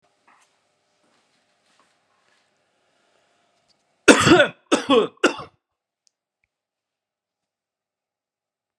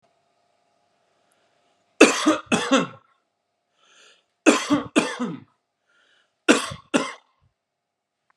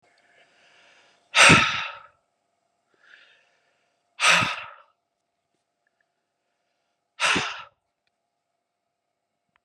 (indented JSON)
{
  "cough_length": "8.8 s",
  "cough_amplitude": 32768,
  "cough_signal_mean_std_ratio": 0.22,
  "three_cough_length": "8.4 s",
  "three_cough_amplitude": 32767,
  "three_cough_signal_mean_std_ratio": 0.31,
  "exhalation_length": "9.6 s",
  "exhalation_amplitude": 27443,
  "exhalation_signal_mean_std_ratio": 0.25,
  "survey_phase": "beta (2021-08-13 to 2022-03-07)",
  "age": "45-64",
  "gender": "Male",
  "wearing_mask": "No",
  "symptom_none": true,
  "smoker_status": "Never smoked",
  "respiratory_condition_asthma": true,
  "respiratory_condition_other": false,
  "recruitment_source": "REACT",
  "submission_delay": "3 days",
  "covid_test_result": "Negative",
  "covid_test_method": "RT-qPCR"
}